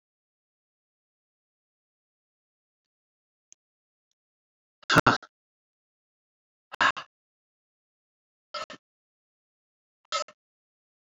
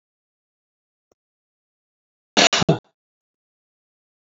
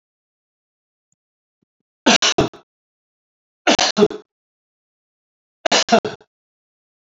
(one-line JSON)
{"exhalation_length": "11.0 s", "exhalation_amplitude": 18255, "exhalation_signal_mean_std_ratio": 0.15, "cough_length": "4.4 s", "cough_amplitude": 27353, "cough_signal_mean_std_ratio": 0.19, "three_cough_length": "7.1 s", "three_cough_amplitude": 31389, "three_cough_signal_mean_std_ratio": 0.28, "survey_phase": "alpha (2021-03-01 to 2021-08-12)", "age": "65+", "gender": "Male", "wearing_mask": "No", "symptom_none": true, "smoker_status": "Ex-smoker", "respiratory_condition_asthma": false, "respiratory_condition_other": false, "recruitment_source": "REACT", "submission_delay": "2 days", "covid_test_result": "Negative", "covid_test_method": "RT-qPCR"}